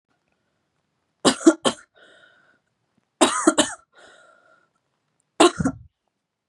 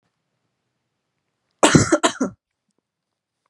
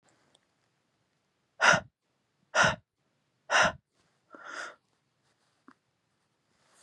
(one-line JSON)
{"three_cough_length": "6.5 s", "three_cough_amplitude": 32421, "three_cough_signal_mean_std_ratio": 0.26, "cough_length": "3.5 s", "cough_amplitude": 32767, "cough_signal_mean_std_ratio": 0.26, "exhalation_length": "6.8 s", "exhalation_amplitude": 15255, "exhalation_signal_mean_std_ratio": 0.25, "survey_phase": "beta (2021-08-13 to 2022-03-07)", "age": "18-44", "gender": "Female", "wearing_mask": "No", "symptom_cough_any": true, "symptom_runny_or_blocked_nose": true, "symptom_sore_throat": true, "symptom_abdominal_pain": true, "symptom_fatigue": true, "symptom_fever_high_temperature": true, "symptom_headache": true, "smoker_status": "Never smoked", "respiratory_condition_asthma": false, "respiratory_condition_other": false, "recruitment_source": "Test and Trace", "submission_delay": "1 day", "covid_test_result": "Positive", "covid_test_method": "RT-qPCR", "covid_ct_value": 17.8, "covid_ct_gene": "ORF1ab gene", "covid_ct_mean": 18.0, "covid_viral_load": "1200000 copies/ml", "covid_viral_load_category": "High viral load (>1M copies/ml)"}